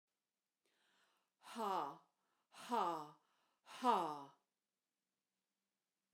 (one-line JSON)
{"exhalation_length": "6.1 s", "exhalation_amplitude": 2650, "exhalation_signal_mean_std_ratio": 0.33, "survey_phase": "beta (2021-08-13 to 2022-03-07)", "age": "45-64", "gender": "Female", "wearing_mask": "No", "symptom_runny_or_blocked_nose": true, "symptom_onset": "13 days", "smoker_status": "Never smoked", "respiratory_condition_asthma": false, "respiratory_condition_other": false, "recruitment_source": "REACT", "submission_delay": "1 day", "covid_test_result": "Negative", "covid_test_method": "RT-qPCR"}